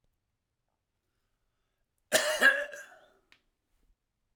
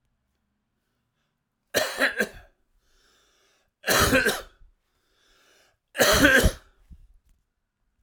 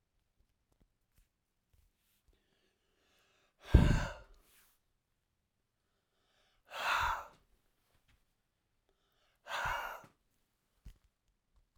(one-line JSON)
{"cough_length": "4.4 s", "cough_amplitude": 14103, "cough_signal_mean_std_ratio": 0.26, "three_cough_length": "8.0 s", "three_cough_amplitude": 23572, "three_cough_signal_mean_std_ratio": 0.34, "exhalation_length": "11.8 s", "exhalation_amplitude": 13170, "exhalation_signal_mean_std_ratio": 0.22, "survey_phase": "alpha (2021-03-01 to 2021-08-12)", "age": "65+", "gender": "Male", "wearing_mask": "No", "symptom_none": true, "smoker_status": "Never smoked", "respiratory_condition_asthma": false, "respiratory_condition_other": false, "recruitment_source": "REACT", "submission_delay": "3 days", "covid_test_result": "Negative", "covid_test_method": "RT-qPCR"}